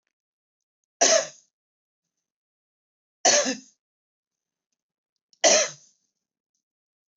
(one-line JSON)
{"three_cough_length": "7.2 s", "three_cough_amplitude": 17052, "three_cough_signal_mean_std_ratio": 0.25, "survey_phase": "beta (2021-08-13 to 2022-03-07)", "age": "65+", "gender": "Female", "wearing_mask": "No", "symptom_sore_throat": true, "symptom_onset": "3 days", "smoker_status": "Never smoked", "respiratory_condition_asthma": false, "respiratory_condition_other": false, "recruitment_source": "REACT", "submission_delay": "1 day", "covid_test_result": "Negative", "covid_test_method": "RT-qPCR", "influenza_a_test_result": "Negative", "influenza_b_test_result": "Negative"}